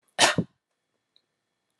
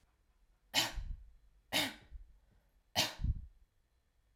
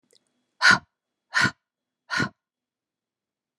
{"cough_length": "1.8 s", "cough_amplitude": 23329, "cough_signal_mean_std_ratio": 0.25, "three_cough_length": "4.4 s", "three_cough_amplitude": 4342, "three_cough_signal_mean_std_ratio": 0.39, "exhalation_length": "3.6 s", "exhalation_amplitude": 23069, "exhalation_signal_mean_std_ratio": 0.26, "survey_phase": "alpha (2021-03-01 to 2021-08-12)", "age": "18-44", "gender": "Female", "wearing_mask": "No", "symptom_none": true, "smoker_status": "Never smoked", "respiratory_condition_asthma": false, "respiratory_condition_other": false, "recruitment_source": "REACT", "submission_delay": "2 days", "covid_test_result": "Negative", "covid_test_method": "RT-qPCR"}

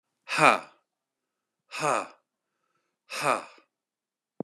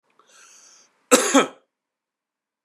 {"exhalation_length": "4.4 s", "exhalation_amplitude": 25552, "exhalation_signal_mean_std_ratio": 0.28, "cough_length": "2.6 s", "cough_amplitude": 30623, "cough_signal_mean_std_ratio": 0.25, "survey_phase": "beta (2021-08-13 to 2022-03-07)", "age": "45-64", "gender": "Male", "wearing_mask": "No", "symptom_runny_or_blocked_nose": true, "symptom_abdominal_pain": true, "symptom_fatigue": true, "symptom_change_to_sense_of_smell_or_taste": true, "symptom_other": true, "symptom_onset": "9 days", "smoker_status": "Ex-smoker", "respiratory_condition_asthma": false, "respiratory_condition_other": false, "recruitment_source": "Test and Trace", "submission_delay": "2 days", "covid_test_result": "Positive", "covid_test_method": "ePCR"}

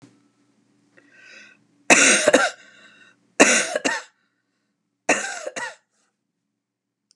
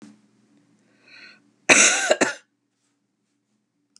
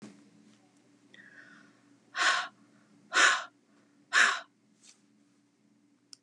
{"three_cough_length": "7.2 s", "three_cough_amplitude": 32768, "three_cough_signal_mean_std_ratio": 0.33, "cough_length": "4.0 s", "cough_amplitude": 31603, "cough_signal_mean_std_ratio": 0.28, "exhalation_length": "6.2 s", "exhalation_amplitude": 12027, "exhalation_signal_mean_std_ratio": 0.3, "survey_phase": "beta (2021-08-13 to 2022-03-07)", "age": "65+", "gender": "Female", "wearing_mask": "No", "symptom_none": true, "symptom_onset": "11 days", "smoker_status": "Ex-smoker", "respiratory_condition_asthma": false, "respiratory_condition_other": false, "recruitment_source": "REACT", "submission_delay": "2 days", "covid_test_result": "Negative", "covid_test_method": "RT-qPCR", "influenza_a_test_result": "Negative", "influenza_b_test_result": "Negative"}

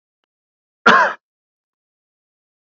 {"cough_length": "2.7 s", "cough_amplitude": 32767, "cough_signal_mean_std_ratio": 0.23, "survey_phase": "beta (2021-08-13 to 2022-03-07)", "age": "45-64", "gender": "Male", "wearing_mask": "No", "symptom_none": true, "smoker_status": "Never smoked", "respiratory_condition_asthma": false, "respiratory_condition_other": false, "recruitment_source": "REACT", "submission_delay": "3 days", "covid_test_result": "Negative", "covid_test_method": "RT-qPCR"}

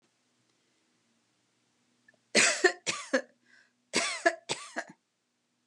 {"cough_length": "5.7 s", "cough_amplitude": 12918, "cough_signal_mean_std_ratio": 0.31, "survey_phase": "alpha (2021-03-01 to 2021-08-12)", "age": "45-64", "gender": "Female", "wearing_mask": "No", "symptom_none": true, "symptom_fatigue": true, "smoker_status": "Ex-smoker", "respiratory_condition_asthma": true, "respiratory_condition_other": false, "recruitment_source": "REACT", "submission_delay": "1 day", "covid_test_result": "Negative", "covid_test_method": "RT-qPCR"}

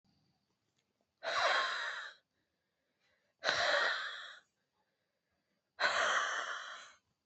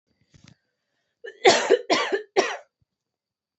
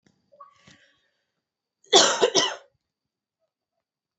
{"exhalation_length": "7.3 s", "exhalation_amplitude": 8344, "exhalation_signal_mean_std_ratio": 0.48, "three_cough_length": "3.6 s", "three_cough_amplitude": 27204, "three_cough_signal_mean_std_ratio": 0.34, "cough_length": "4.2 s", "cough_amplitude": 28026, "cough_signal_mean_std_ratio": 0.26, "survey_phase": "alpha (2021-03-01 to 2021-08-12)", "age": "18-44", "gender": "Female", "wearing_mask": "No", "symptom_cough_any": true, "symptom_headache": true, "symptom_change_to_sense_of_smell_or_taste": true, "symptom_loss_of_taste": true, "symptom_onset": "7 days", "smoker_status": "Never smoked", "respiratory_condition_asthma": false, "respiratory_condition_other": false, "recruitment_source": "Test and Trace", "submission_delay": "5 days", "covid_test_result": "Positive", "covid_test_method": "RT-qPCR", "covid_ct_value": 18.4, "covid_ct_gene": "ORF1ab gene", "covid_ct_mean": 19.2, "covid_viral_load": "520000 copies/ml", "covid_viral_load_category": "Low viral load (10K-1M copies/ml)"}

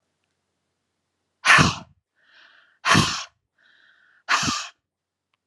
{"exhalation_length": "5.5 s", "exhalation_amplitude": 28462, "exhalation_signal_mean_std_ratio": 0.31, "survey_phase": "beta (2021-08-13 to 2022-03-07)", "age": "45-64", "gender": "Female", "wearing_mask": "No", "symptom_cough_any": true, "symptom_sore_throat": true, "smoker_status": "Never smoked", "respiratory_condition_asthma": false, "respiratory_condition_other": false, "recruitment_source": "Test and Trace", "submission_delay": "2 days", "covid_test_result": "Positive", "covid_test_method": "RT-qPCR"}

